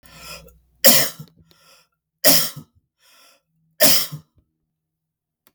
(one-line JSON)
{"three_cough_length": "5.5 s", "three_cough_amplitude": 32768, "three_cough_signal_mean_std_ratio": 0.3, "survey_phase": "beta (2021-08-13 to 2022-03-07)", "age": "45-64", "gender": "Male", "wearing_mask": "No", "symptom_none": true, "smoker_status": "Never smoked", "respiratory_condition_asthma": false, "respiratory_condition_other": false, "recruitment_source": "REACT", "submission_delay": "0 days", "covid_test_result": "Negative", "covid_test_method": "RT-qPCR"}